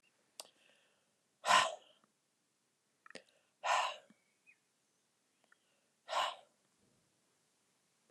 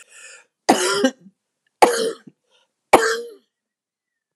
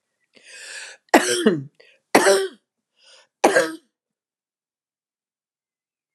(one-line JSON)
{"exhalation_length": "8.1 s", "exhalation_amplitude": 5463, "exhalation_signal_mean_std_ratio": 0.24, "three_cough_length": "4.4 s", "three_cough_amplitude": 32768, "three_cough_signal_mean_std_ratio": 0.34, "cough_length": "6.1 s", "cough_amplitude": 32762, "cough_signal_mean_std_ratio": 0.31, "survey_phase": "alpha (2021-03-01 to 2021-08-12)", "age": "45-64", "gender": "Female", "wearing_mask": "No", "symptom_none": true, "smoker_status": "Ex-smoker", "respiratory_condition_asthma": false, "respiratory_condition_other": false, "recruitment_source": "REACT", "submission_delay": "2 days", "covid_test_result": "Negative", "covid_test_method": "RT-qPCR"}